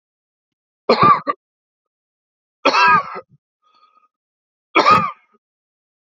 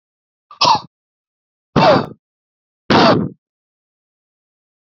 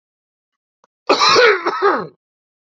{
  "three_cough_length": "6.1 s",
  "three_cough_amplitude": 32768,
  "three_cough_signal_mean_std_ratio": 0.34,
  "exhalation_length": "4.9 s",
  "exhalation_amplitude": 31986,
  "exhalation_signal_mean_std_ratio": 0.34,
  "cough_length": "2.6 s",
  "cough_amplitude": 29602,
  "cough_signal_mean_std_ratio": 0.46,
  "survey_phase": "beta (2021-08-13 to 2022-03-07)",
  "age": "45-64",
  "gender": "Male",
  "wearing_mask": "No",
  "symptom_runny_or_blocked_nose": true,
  "symptom_headache": true,
  "smoker_status": "Never smoked",
  "respiratory_condition_asthma": true,
  "respiratory_condition_other": false,
  "recruitment_source": "Test and Trace",
  "submission_delay": "2 days",
  "covid_test_result": "Positive",
  "covid_test_method": "RT-qPCR",
  "covid_ct_value": 17.4,
  "covid_ct_gene": "ORF1ab gene",
  "covid_ct_mean": 17.9,
  "covid_viral_load": "1400000 copies/ml",
  "covid_viral_load_category": "High viral load (>1M copies/ml)"
}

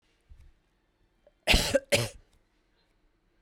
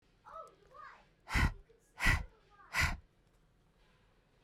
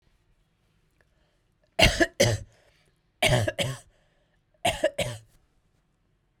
{
  "cough_length": "3.4 s",
  "cough_amplitude": 12144,
  "cough_signal_mean_std_ratio": 0.28,
  "exhalation_length": "4.4 s",
  "exhalation_amplitude": 5380,
  "exhalation_signal_mean_std_ratio": 0.34,
  "three_cough_length": "6.4 s",
  "three_cough_amplitude": 22164,
  "three_cough_signal_mean_std_ratio": 0.33,
  "survey_phase": "beta (2021-08-13 to 2022-03-07)",
  "age": "18-44",
  "gender": "Female",
  "wearing_mask": "No",
  "symptom_headache": true,
  "symptom_onset": "6 days",
  "smoker_status": "Never smoked",
  "respiratory_condition_asthma": false,
  "respiratory_condition_other": false,
  "recruitment_source": "REACT",
  "submission_delay": "5 days",
  "covid_test_result": "Negative",
  "covid_test_method": "RT-qPCR",
  "influenza_a_test_result": "Negative",
  "influenza_b_test_result": "Negative"
}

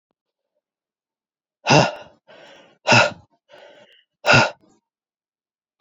{
  "exhalation_length": "5.8 s",
  "exhalation_amplitude": 28067,
  "exhalation_signal_mean_std_ratio": 0.28,
  "survey_phase": "alpha (2021-03-01 to 2021-08-12)",
  "age": "18-44",
  "gender": "Male",
  "wearing_mask": "No",
  "symptom_cough_any": true,
  "symptom_new_continuous_cough": true,
  "symptom_diarrhoea": true,
  "symptom_fatigue": true,
  "symptom_onset": "3 days",
  "smoker_status": "Current smoker (e-cigarettes or vapes only)",
  "respiratory_condition_asthma": false,
  "respiratory_condition_other": false,
  "recruitment_source": "Test and Trace",
  "submission_delay": "2 days",
  "covid_test_result": "Positive",
  "covid_test_method": "ePCR"
}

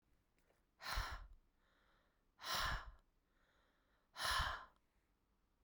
{
  "exhalation_length": "5.6 s",
  "exhalation_amplitude": 1635,
  "exhalation_signal_mean_std_ratio": 0.4,
  "survey_phase": "beta (2021-08-13 to 2022-03-07)",
  "age": "45-64",
  "gender": "Female",
  "wearing_mask": "No",
  "symptom_runny_or_blocked_nose": true,
  "symptom_onset": "12 days",
  "smoker_status": "Never smoked",
  "respiratory_condition_asthma": false,
  "respiratory_condition_other": false,
  "recruitment_source": "REACT",
  "submission_delay": "3 days",
  "covid_test_result": "Negative",
  "covid_test_method": "RT-qPCR"
}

